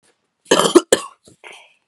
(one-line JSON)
{"cough_length": "1.9 s", "cough_amplitude": 32768, "cough_signal_mean_std_ratio": 0.3, "survey_phase": "beta (2021-08-13 to 2022-03-07)", "age": "18-44", "gender": "Female", "wearing_mask": "No", "symptom_cough_any": true, "symptom_runny_or_blocked_nose": true, "symptom_sore_throat": true, "symptom_fatigue": true, "symptom_onset": "3 days", "smoker_status": "Never smoked", "respiratory_condition_asthma": false, "respiratory_condition_other": false, "recruitment_source": "Test and Trace", "submission_delay": "1 day", "covid_test_result": "Positive", "covid_test_method": "RT-qPCR", "covid_ct_value": 21.7, "covid_ct_gene": "ORF1ab gene"}